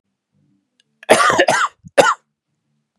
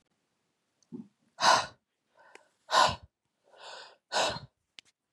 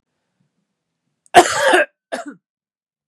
{"three_cough_length": "3.0 s", "three_cough_amplitude": 32768, "three_cough_signal_mean_std_ratio": 0.38, "exhalation_length": "5.1 s", "exhalation_amplitude": 10462, "exhalation_signal_mean_std_ratio": 0.3, "cough_length": "3.1 s", "cough_amplitude": 32768, "cough_signal_mean_std_ratio": 0.3, "survey_phase": "beta (2021-08-13 to 2022-03-07)", "age": "18-44", "gender": "Male", "wearing_mask": "No", "symptom_cough_any": true, "symptom_fatigue": true, "symptom_headache": true, "symptom_other": true, "smoker_status": "Never smoked", "respiratory_condition_asthma": false, "respiratory_condition_other": false, "recruitment_source": "Test and Trace", "submission_delay": "2 days", "covid_test_result": "Positive", "covid_test_method": "RT-qPCR", "covid_ct_value": 16.8, "covid_ct_gene": "ORF1ab gene", "covid_ct_mean": 16.9, "covid_viral_load": "2900000 copies/ml", "covid_viral_load_category": "High viral load (>1M copies/ml)"}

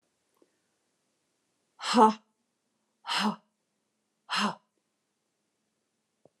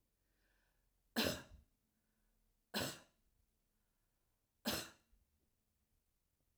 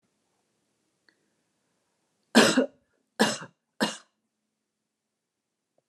{"exhalation_length": "6.4 s", "exhalation_amplitude": 15120, "exhalation_signal_mean_std_ratio": 0.24, "three_cough_length": "6.6 s", "three_cough_amplitude": 2166, "three_cough_signal_mean_std_ratio": 0.26, "cough_length": "5.9 s", "cough_amplitude": 21629, "cough_signal_mean_std_ratio": 0.23, "survey_phase": "alpha (2021-03-01 to 2021-08-12)", "age": "45-64", "gender": "Female", "wearing_mask": "No", "symptom_none": true, "smoker_status": "Ex-smoker", "respiratory_condition_asthma": false, "respiratory_condition_other": false, "recruitment_source": "REACT", "submission_delay": "2 days", "covid_test_result": "Negative", "covid_test_method": "RT-qPCR"}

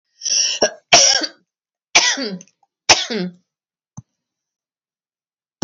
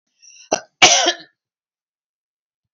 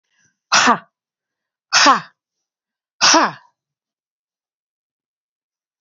{"three_cough_length": "5.6 s", "three_cough_amplitude": 32768, "three_cough_signal_mean_std_ratio": 0.37, "cough_length": "2.7 s", "cough_amplitude": 30530, "cough_signal_mean_std_ratio": 0.28, "exhalation_length": "5.8 s", "exhalation_amplitude": 32768, "exhalation_signal_mean_std_ratio": 0.29, "survey_phase": "beta (2021-08-13 to 2022-03-07)", "age": "45-64", "gender": "Female", "wearing_mask": "No", "symptom_none": true, "smoker_status": "Never smoked", "respiratory_condition_asthma": false, "respiratory_condition_other": false, "recruitment_source": "REACT", "submission_delay": "2 days", "covid_test_result": "Negative", "covid_test_method": "RT-qPCR", "influenza_a_test_result": "Negative", "influenza_b_test_result": "Negative"}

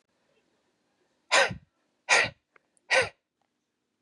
{"exhalation_length": "4.0 s", "exhalation_amplitude": 12320, "exhalation_signal_mean_std_ratio": 0.29, "survey_phase": "beta (2021-08-13 to 2022-03-07)", "age": "18-44", "gender": "Female", "wearing_mask": "No", "symptom_cough_any": true, "symptom_runny_or_blocked_nose": true, "symptom_shortness_of_breath": true, "symptom_abdominal_pain": true, "symptom_fatigue": true, "symptom_loss_of_taste": true, "smoker_status": "Never smoked", "respiratory_condition_asthma": false, "respiratory_condition_other": false, "recruitment_source": "Test and Trace", "submission_delay": "2 days", "covid_test_result": "Positive", "covid_test_method": "RT-qPCR", "covid_ct_value": 22.9, "covid_ct_gene": "N gene", "covid_ct_mean": 24.1, "covid_viral_load": "13000 copies/ml", "covid_viral_load_category": "Low viral load (10K-1M copies/ml)"}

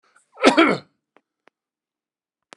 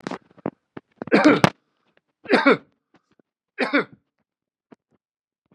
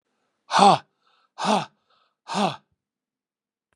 {"cough_length": "2.6 s", "cough_amplitude": 32767, "cough_signal_mean_std_ratio": 0.26, "three_cough_length": "5.5 s", "three_cough_amplitude": 32768, "three_cough_signal_mean_std_ratio": 0.29, "exhalation_length": "3.8 s", "exhalation_amplitude": 27158, "exhalation_signal_mean_std_ratio": 0.3, "survey_phase": "beta (2021-08-13 to 2022-03-07)", "age": "65+", "gender": "Male", "wearing_mask": "No", "symptom_runny_or_blocked_nose": true, "symptom_onset": "3 days", "smoker_status": "Ex-smoker", "respiratory_condition_asthma": false, "respiratory_condition_other": false, "recruitment_source": "REACT", "submission_delay": "0 days", "covid_test_result": "Negative", "covid_test_method": "RT-qPCR", "influenza_a_test_result": "Negative", "influenza_b_test_result": "Negative"}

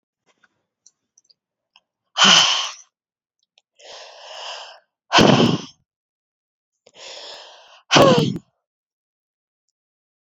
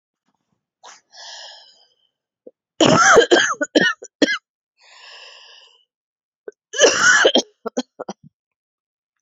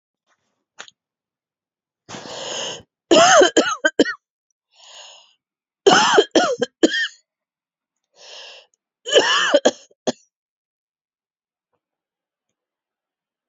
{"exhalation_length": "10.2 s", "exhalation_amplitude": 32768, "exhalation_signal_mean_std_ratio": 0.31, "cough_length": "9.2 s", "cough_amplitude": 31609, "cough_signal_mean_std_ratio": 0.36, "three_cough_length": "13.5 s", "three_cough_amplitude": 32517, "three_cough_signal_mean_std_ratio": 0.32, "survey_phase": "beta (2021-08-13 to 2022-03-07)", "age": "18-44", "gender": "Female", "wearing_mask": "No", "symptom_cough_any": true, "symptom_runny_or_blocked_nose": true, "symptom_other": true, "symptom_onset": "7 days", "smoker_status": "Never smoked", "respiratory_condition_asthma": false, "respiratory_condition_other": false, "recruitment_source": "Test and Trace", "submission_delay": "3 days", "covid_test_result": "Negative", "covid_test_method": "RT-qPCR"}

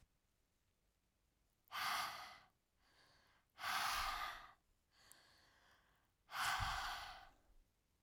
{"exhalation_length": "8.0 s", "exhalation_amplitude": 1140, "exhalation_signal_mean_std_ratio": 0.46, "survey_phase": "alpha (2021-03-01 to 2021-08-12)", "age": "18-44", "gender": "Female", "wearing_mask": "No", "symptom_none": true, "smoker_status": "Ex-smoker", "respiratory_condition_asthma": false, "respiratory_condition_other": false, "recruitment_source": "REACT", "submission_delay": "1 day", "covid_test_result": "Negative", "covid_test_method": "RT-qPCR"}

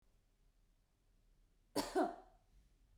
{"cough_length": "3.0 s", "cough_amplitude": 2070, "cough_signal_mean_std_ratio": 0.28, "survey_phase": "beta (2021-08-13 to 2022-03-07)", "age": "45-64", "gender": "Female", "wearing_mask": "No", "symptom_none": true, "smoker_status": "Never smoked", "respiratory_condition_asthma": false, "respiratory_condition_other": false, "recruitment_source": "REACT", "submission_delay": "1 day", "covid_test_result": "Negative", "covid_test_method": "RT-qPCR"}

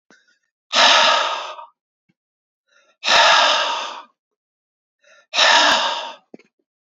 {"exhalation_length": "6.9 s", "exhalation_amplitude": 29268, "exhalation_signal_mean_std_ratio": 0.47, "survey_phase": "beta (2021-08-13 to 2022-03-07)", "age": "45-64", "gender": "Male", "wearing_mask": "No", "symptom_headache": true, "symptom_onset": "10 days", "smoker_status": "Never smoked", "respiratory_condition_asthma": true, "respiratory_condition_other": false, "recruitment_source": "REACT", "submission_delay": "0 days", "covid_test_result": "Negative", "covid_test_method": "RT-qPCR", "influenza_a_test_result": "Negative", "influenza_b_test_result": "Negative"}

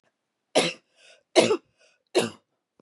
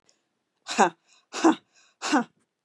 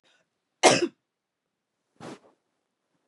{"three_cough_length": "2.8 s", "three_cough_amplitude": 22155, "three_cough_signal_mean_std_ratio": 0.31, "exhalation_length": "2.6 s", "exhalation_amplitude": 21661, "exhalation_signal_mean_std_ratio": 0.31, "cough_length": "3.1 s", "cough_amplitude": 25370, "cough_signal_mean_std_ratio": 0.21, "survey_phase": "beta (2021-08-13 to 2022-03-07)", "age": "45-64", "gender": "Female", "wearing_mask": "No", "symptom_none": true, "smoker_status": "Never smoked", "respiratory_condition_asthma": false, "respiratory_condition_other": false, "recruitment_source": "Test and Trace", "submission_delay": "2 days", "covid_test_result": "Positive", "covid_test_method": "LFT"}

